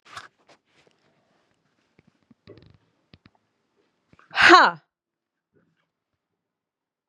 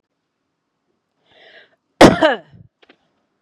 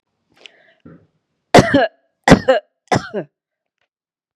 {"exhalation_length": "7.1 s", "exhalation_amplitude": 30209, "exhalation_signal_mean_std_ratio": 0.17, "cough_length": "3.4 s", "cough_amplitude": 32768, "cough_signal_mean_std_ratio": 0.22, "three_cough_length": "4.4 s", "three_cough_amplitude": 32768, "three_cough_signal_mean_std_ratio": 0.29, "survey_phase": "beta (2021-08-13 to 2022-03-07)", "age": "45-64", "gender": "Female", "wearing_mask": "No", "symptom_none": true, "smoker_status": "Never smoked", "respiratory_condition_asthma": false, "respiratory_condition_other": false, "recruitment_source": "REACT", "submission_delay": "5 days", "covid_test_result": "Negative", "covid_test_method": "RT-qPCR", "influenza_a_test_result": "Negative", "influenza_b_test_result": "Negative"}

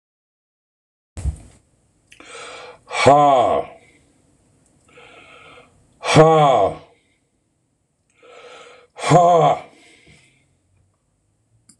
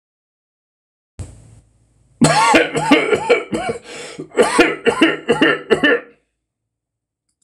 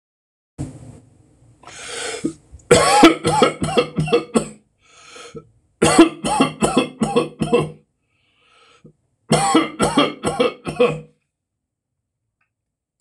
{"exhalation_length": "11.8 s", "exhalation_amplitude": 26028, "exhalation_signal_mean_std_ratio": 0.35, "cough_length": "7.4 s", "cough_amplitude": 26028, "cough_signal_mean_std_ratio": 0.49, "three_cough_length": "13.0 s", "three_cough_amplitude": 26028, "three_cough_signal_mean_std_ratio": 0.44, "survey_phase": "alpha (2021-03-01 to 2021-08-12)", "age": "65+", "gender": "Male", "wearing_mask": "No", "symptom_none": true, "smoker_status": "Never smoked", "respiratory_condition_asthma": false, "respiratory_condition_other": false, "recruitment_source": "REACT", "submission_delay": "1 day", "covid_test_result": "Negative", "covid_test_method": "RT-qPCR"}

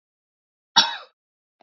{"cough_length": "1.6 s", "cough_amplitude": 28903, "cough_signal_mean_std_ratio": 0.22, "survey_phase": "beta (2021-08-13 to 2022-03-07)", "age": "18-44", "gender": "Male", "wearing_mask": "No", "symptom_cough_any": true, "symptom_runny_or_blocked_nose": true, "symptom_sore_throat": true, "symptom_fatigue": true, "symptom_headache": true, "smoker_status": "Ex-smoker", "respiratory_condition_asthma": false, "respiratory_condition_other": false, "recruitment_source": "Test and Trace", "submission_delay": "1 day", "covid_test_result": "Positive", "covid_test_method": "ePCR"}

